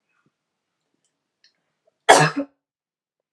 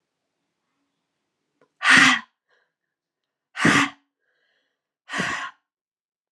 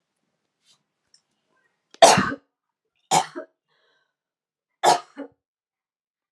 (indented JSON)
{
  "cough_length": "3.3 s",
  "cough_amplitude": 32768,
  "cough_signal_mean_std_ratio": 0.21,
  "exhalation_length": "6.3 s",
  "exhalation_amplitude": 29949,
  "exhalation_signal_mean_std_ratio": 0.28,
  "three_cough_length": "6.3 s",
  "three_cough_amplitude": 32767,
  "three_cough_signal_mean_std_ratio": 0.22,
  "survey_phase": "beta (2021-08-13 to 2022-03-07)",
  "age": "45-64",
  "gender": "Female",
  "wearing_mask": "No",
  "symptom_cough_any": true,
  "symptom_runny_or_blocked_nose": true,
  "symptom_shortness_of_breath": true,
  "symptom_sore_throat": true,
  "symptom_fatigue": true,
  "symptom_headache": true,
  "symptom_other": true,
  "smoker_status": "Never smoked",
  "respiratory_condition_asthma": false,
  "respiratory_condition_other": false,
  "recruitment_source": "Test and Trace",
  "submission_delay": "2 days",
  "covid_test_result": "Positive",
  "covid_test_method": "RT-qPCR",
  "covid_ct_value": 23.4,
  "covid_ct_gene": "N gene"
}